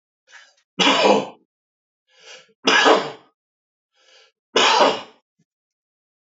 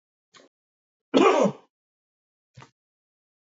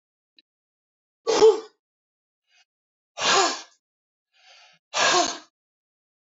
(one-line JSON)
{"three_cough_length": "6.2 s", "three_cough_amplitude": 27335, "three_cough_signal_mean_std_ratio": 0.37, "cough_length": "3.5 s", "cough_amplitude": 21176, "cough_signal_mean_std_ratio": 0.27, "exhalation_length": "6.2 s", "exhalation_amplitude": 18279, "exhalation_signal_mean_std_ratio": 0.32, "survey_phase": "beta (2021-08-13 to 2022-03-07)", "age": "45-64", "gender": "Male", "wearing_mask": "No", "symptom_none": true, "smoker_status": "Ex-smoker", "respiratory_condition_asthma": false, "respiratory_condition_other": false, "recruitment_source": "REACT", "submission_delay": "5 days", "covid_test_result": "Negative", "covid_test_method": "RT-qPCR", "influenza_a_test_result": "Negative", "influenza_b_test_result": "Negative"}